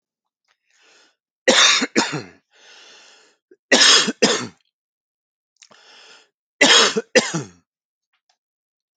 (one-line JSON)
{"three_cough_length": "9.0 s", "three_cough_amplitude": 32767, "three_cough_signal_mean_std_ratio": 0.34, "survey_phase": "beta (2021-08-13 to 2022-03-07)", "age": "45-64", "gender": "Male", "wearing_mask": "No", "symptom_none": true, "smoker_status": "Never smoked", "respiratory_condition_asthma": false, "respiratory_condition_other": false, "recruitment_source": "REACT", "submission_delay": "1 day", "covid_test_result": "Negative", "covid_test_method": "RT-qPCR"}